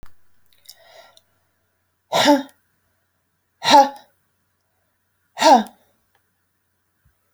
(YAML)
exhalation_length: 7.3 s
exhalation_amplitude: 28071
exhalation_signal_mean_std_ratio: 0.26
survey_phase: alpha (2021-03-01 to 2021-08-12)
age: 45-64
gender: Female
wearing_mask: 'No'
symptom_none: true
smoker_status: Current smoker (1 to 10 cigarettes per day)
respiratory_condition_asthma: false
respiratory_condition_other: false
recruitment_source: REACT
submission_delay: 2 days
covid_test_method: RT-qPCR